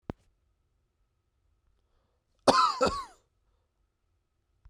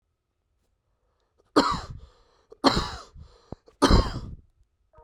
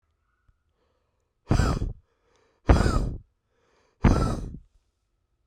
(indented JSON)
{
  "cough_length": "4.7 s",
  "cough_amplitude": 18211,
  "cough_signal_mean_std_ratio": 0.24,
  "three_cough_length": "5.0 s",
  "three_cough_amplitude": 20459,
  "three_cough_signal_mean_std_ratio": 0.31,
  "exhalation_length": "5.5 s",
  "exhalation_amplitude": 20999,
  "exhalation_signal_mean_std_ratio": 0.36,
  "survey_phase": "beta (2021-08-13 to 2022-03-07)",
  "age": "18-44",
  "gender": "Male",
  "wearing_mask": "No",
  "symptom_change_to_sense_of_smell_or_taste": true,
  "symptom_loss_of_taste": true,
  "symptom_onset": "3 days",
  "smoker_status": "Never smoked",
  "respiratory_condition_asthma": false,
  "respiratory_condition_other": false,
  "recruitment_source": "Test and Trace",
  "submission_delay": "2 days",
  "covid_test_result": "Positive",
  "covid_test_method": "RT-qPCR",
  "covid_ct_value": 18.1,
  "covid_ct_gene": "ORF1ab gene",
  "covid_ct_mean": 18.3,
  "covid_viral_load": "1000000 copies/ml",
  "covid_viral_load_category": "High viral load (>1M copies/ml)"
}